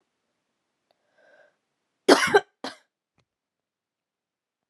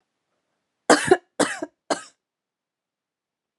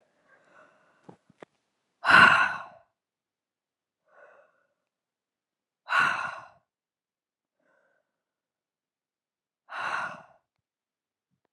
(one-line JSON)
{"cough_length": "4.7 s", "cough_amplitude": 31010, "cough_signal_mean_std_ratio": 0.18, "three_cough_length": "3.6 s", "three_cough_amplitude": 31439, "three_cough_signal_mean_std_ratio": 0.24, "exhalation_length": "11.5 s", "exhalation_amplitude": 22833, "exhalation_signal_mean_std_ratio": 0.22, "survey_phase": "beta (2021-08-13 to 2022-03-07)", "age": "18-44", "gender": "Female", "wearing_mask": "No", "symptom_abdominal_pain": true, "symptom_headache": true, "smoker_status": "Never smoked", "respiratory_condition_asthma": false, "respiratory_condition_other": false, "recruitment_source": "Test and Trace", "submission_delay": "1 day", "covid_test_result": "Positive", "covid_test_method": "RT-qPCR", "covid_ct_value": 25.8, "covid_ct_gene": "ORF1ab gene"}